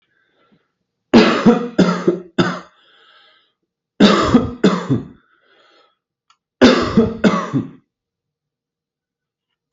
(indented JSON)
{
  "three_cough_length": "9.7 s",
  "three_cough_amplitude": 32768,
  "three_cough_signal_mean_std_ratio": 0.4,
  "survey_phase": "beta (2021-08-13 to 2022-03-07)",
  "age": "18-44",
  "gender": "Male",
  "wearing_mask": "No",
  "symptom_none": true,
  "smoker_status": "Never smoked",
  "respiratory_condition_asthma": false,
  "respiratory_condition_other": false,
  "recruitment_source": "REACT",
  "submission_delay": "1 day",
  "covid_test_result": "Negative",
  "covid_test_method": "RT-qPCR"
}